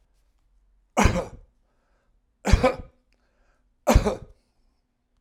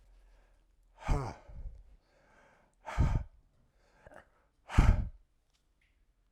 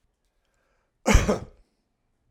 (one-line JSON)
{"three_cough_length": "5.2 s", "three_cough_amplitude": 23728, "three_cough_signal_mean_std_ratio": 0.28, "exhalation_length": "6.3 s", "exhalation_amplitude": 12940, "exhalation_signal_mean_std_ratio": 0.29, "cough_length": "2.3 s", "cough_amplitude": 20068, "cough_signal_mean_std_ratio": 0.27, "survey_phase": "alpha (2021-03-01 to 2021-08-12)", "age": "65+", "gender": "Male", "wearing_mask": "No", "symptom_none": true, "smoker_status": "Ex-smoker", "respiratory_condition_asthma": false, "respiratory_condition_other": false, "recruitment_source": "REACT", "submission_delay": "2 days", "covid_test_result": "Negative", "covid_test_method": "RT-qPCR"}